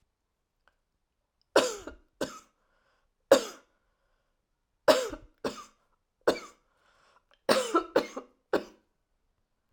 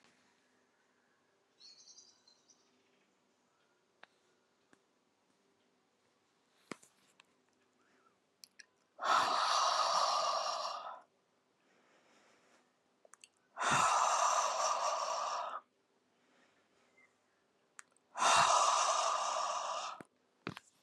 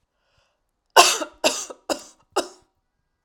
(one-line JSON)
{"three_cough_length": "9.7 s", "three_cough_amplitude": 17942, "three_cough_signal_mean_std_ratio": 0.26, "exhalation_length": "20.8 s", "exhalation_amplitude": 4770, "exhalation_signal_mean_std_ratio": 0.43, "cough_length": "3.2 s", "cough_amplitude": 32768, "cough_signal_mean_std_ratio": 0.28, "survey_phase": "alpha (2021-03-01 to 2021-08-12)", "age": "65+", "gender": "Female", "wearing_mask": "No", "symptom_none": true, "smoker_status": "Never smoked", "respiratory_condition_asthma": false, "respiratory_condition_other": false, "recruitment_source": "REACT", "submission_delay": "2 days", "covid_test_result": "Negative", "covid_test_method": "RT-qPCR"}